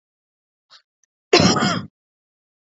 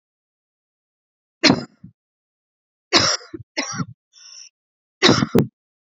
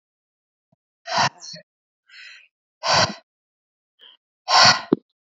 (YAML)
cough_length: 2.6 s
cough_amplitude: 27933
cough_signal_mean_std_ratio: 0.32
three_cough_length: 5.9 s
three_cough_amplitude: 31283
three_cough_signal_mean_std_ratio: 0.3
exhalation_length: 5.4 s
exhalation_amplitude: 28712
exhalation_signal_mean_std_ratio: 0.3
survey_phase: beta (2021-08-13 to 2022-03-07)
age: 18-44
gender: Female
wearing_mask: 'No'
symptom_cough_any: true
symptom_new_continuous_cough: true
symptom_runny_or_blocked_nose: true
symptom_shortness_of_breath: true
symptom_fatigue: true
symptom_headache: true
symptom_onset: 2 days
smoker_status: Ex-smoker
respiratory_condition_asthma: false
respiratory_condition_other: false
recruitment_source: Test and Trace
submission_delay: 1 day
covid_test_result: Positive
covid_test_method: RT-qPCR
covid_ct_value: 20.1
covid_ct_gene: ORF1ab gene
covid_ct_mean: 20.4
covid_viral_load: 210000 copies/ml
covid_viral_load_category: Low viral load (10K-1M copies/ml)